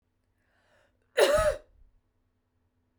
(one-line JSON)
{"cough_length": "3.0 s", "cough_amplitude": 12071, "cough_signal_mean_std_ratio": 0.3, "survey_phase": "beta (2021-08-13 to 2022-03-07)", "age": "45-64", "gender": "Female", "wearing_mask": "No", "symptom_none": true, "smoker_status": "Never smoked", "respiratory_condition_asthma": false, "respiratory_condition_other": false, "recruitment_source": "REACT", "submission_delay": "0 days", "covid_test_result": "Negative", "covid_test_method": "RT-qPCR", "influenza_a_test_result": "Negative", "influenza_b_test_result": "Negative"}